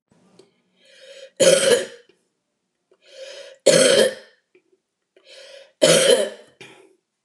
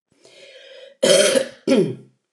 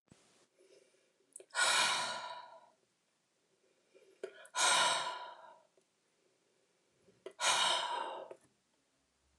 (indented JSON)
{
  "three_cough_length": "7.2 s",
  "three_cough_amplitude": 28712,
  "three_cough_signal_mean_std_ratio": 0.37,
  "cough_length": "2.3 s",
  "cough_amplitude": 27151,
  "cough_signal_mean_std_ratio": 0.47,
  "exhalation_length": "9.4 s",
  "exhalation_amplitude": 4006,
  "exhalation_signal_mean_std_ratio": 0.41,
  "survey_phase": "alpha (2021-03-01 to 2021-08-12)",
  "age": "65+",
  "gender": "Female",
  "wearing_mask": "No",
  "symptom_none": true,
  "smoker_status": "Never smoked",
  "respiratory_condition_asthma": false,
  "respiratory_condition_other": false,
  "recruitment_source": "REACT",
  "submission_delay": "4 days",
  "covid_test_result": "Negative",
  "covid_test_method": "RT-qPCR"
}